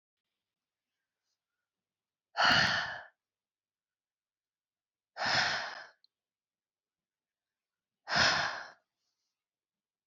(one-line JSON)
{"exhalation_length": "10.1 s", "exhalation_amplitude": 7946, "exhalation_signal_mean_std_ratio": 0.31, "survey_phase": "beta (2021-08-13 to 2022-03-07)", "age": "45-64", "gender": "Female", "wearing_mask": "No", "symptom_none": true, "smoker_status": "Current smoker (e-cigarettes or vapes only)", "respiratory_condition_asthma": false, "respiratory_condition_other": false, "recruitment_source": "REACT", "submission_delay": "2 days", "covid_test_result": "Negative", "covid_test_method": "RT-qPCR"}